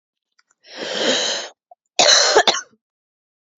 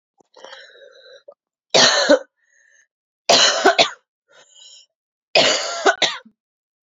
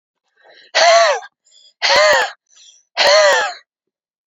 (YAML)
cough_length: 3.6 s
cough_amplitude: 32768
cough_signal_mean_std_ratio: 0.44
three_cough_length: 6.8 s
three_cough_amplitude: 32768
three_cough_signal_mean_std_ratio: 0.39
exhalation_length: 4.3 s
exhalation_amplitude: 30715
exhalation_signal_mean_std_ratio: 0.52
survey_phase: beta (2021-08-13 to 2022-03-07)
age: 18-44
gender: Female
wearing_mask: 'No'
symptom_cough_any: true
symptom_runny_or_blocked_nose: true
symptom_shortness_of_breath: true
symptom_fatigue: true
symptom_headache: true
symptom_loss_of_taste: true
symptom_onset: 3 days
smoker_status: Never smoked
respiratory_condition_asthma: false
respiratory_condition_other: false
recruitment_source: Test and Trace
submission_delay: 2 days
covid_test_result: Positive
covid_test_method: ePCR